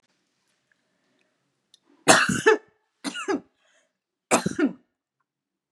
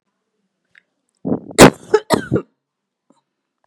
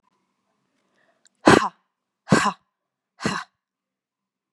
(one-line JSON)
{"three_cough_length": "5.7 s", "three_cough_amplitude": 32767, "three_cough_signal_mean_std_ratio": 0.29, "cough_length": "3.7 s", "cough_amplitude": 32768, "cough_signal_mean_std_ratio": 0.25, "exhalation_length": "4.5 s", "exhalation_amplitude": 32751, "exhalation_signal_mean_std_ratio": 0.23, "survey_phase": "beta (2021-08-13 to 2022-03-07)", "age": "18-44", "gender": "Female", "wearing_mask": "No", "symptom_none": true, "smoker_status": "Never smoked", "respiratory_condition_asthma": false, "respiratory_condition_other": false, "recruitment_source": "Test and Trace", "submission_delay": "2 days", "covid_test_result": "Positive", "covid_test_method": "ePCR"}